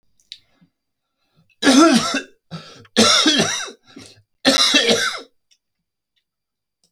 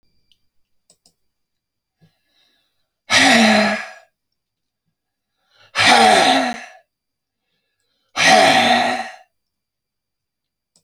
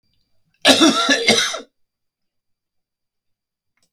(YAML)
three_cough_length: 6.9 s
three_cough_amplitude: 32768
three_cough_signal_mean_std_ratio: 0.43
exhalation_length: 10.8 s
exhalation_amplitude: 32768
exhalation_signal_mean_std_ratio: 0.39
cough_length: 3.9 s
cough_amplitude: 32702
cough_signal_mean_std_ratio: 0.36
survey_phase: beta (2021-08-13 to 2022-03-07)
age: 65+
gender: Male
wearing_mask: 'No'
symptom_none: true
smoker_status: Never smoked
respiratory_condition_asthma: false
respiratory_condition_other: false
recruitment_source: REACT
submission_delay: 0 days
covid_test_result: Negative
covid_test_method: RT-qPCR